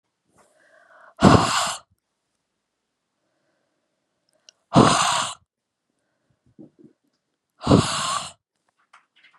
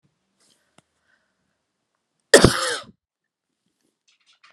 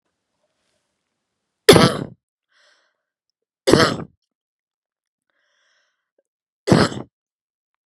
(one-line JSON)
{"exhalation_length": "9.4 s", "exhalation_amplitude": 32399, "exhalation_signal_mean_std_ratio": 0.29, "cough_length": "4.5 s", "cough_amplitude": 32768, "cough_signal_mean_std_ratio": 0.18, "three_cough_length": "7.9 s", "three_cough_amplitude": 32768, "three_cough_signal_mean_std_ratio": 0.23, "survey_phase": "beta (2021-08-13 to 2022-03-07)", "age": "18-44", "gender": "Female", "wearing_mask": "No", "symptom_cough_any": true, "symptom_runny_or_blocked_nose": true, "symptom_fatigue": true, "symptom_headache": true, "symptom_change_to_sense_of_smell_or_taste": true, "symptom_other": true, "symptom_onset": "2 days", "smoker_status": "Ex-smoker", "respiratory_condition_asthma": true, "respiratory_condition_other": false, "recruitment_source": "Test and Trace", "submission_delay": "1 day", "covid_test_result": "Positive", "covid_test_method": "RT-qPCR", "covid_ct_value": 21.2, "covid_ct_gene": "ORF1ab gene"}